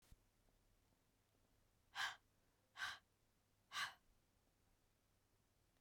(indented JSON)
{
  "exhalation_length": "5.8 s",
  "exhalation_amplitude": 782,
  "exhalation_signal_mean_std_ratio": 0.29,
  "survey_phase": "beta (2021-08-13 to 2022-03-07)",
  "age": "45-64",
  "gender": "Female",
  "wearing_mask": "No",
  "symptom_cough_any": true,
  "symptom_runny_or_blocked_nose": true,
  "symptom_sore_throat": true,
  "symptom_fatigue": true,
  "symptom_fever_high_temperature": true,
  "symptom_headache": true,
  "smoker_status": "Never smoked",
  "respiratory_condition_asthma": false,
  "respiratory_condition_other": false,
  "recruitment_source": "Test and Trace",
  "submission_delay": "2 days",
  "covid_test_result": "Positive",
  "covid_test_method": "RT-qPCR",
  "covid_ct_value": 33.2,
  "covid_ct_gene": "ORF1ab gene"
}